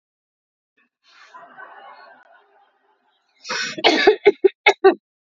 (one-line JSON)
{"three_cough_length": "5.4 s", "three_cough_amplitude": 28727, "three_cough_signal_mean_std_ratio": 0.28, "survey_phase": "alpha (2021-03-01 to 2021-08-12)", "age": "45-64", "gender": "Female", "wearing_mask": "No", "symptom_fever_high_temperature": true, "symptom_loss_of_taste": true, "symptom_onset": "7 days", "smoker_status": "Never smoked", "respiratory_condition_asthma": false, "respiratory_condition_other": false, "recruitment_source": "Test and Trace", "submission_delay": "1 day", "covid_test_result": "Positive", "covid_test_method": "RT-qPCR", "covid_ct_value": 12.5, "covid_ct_gene": "ORF1ab gene", "covid_ct_mean": 12.9, "covid_viral_load": "58000000 copies/ml", "covid_viral_load_category": "High viral load (>1M copies/ml)"}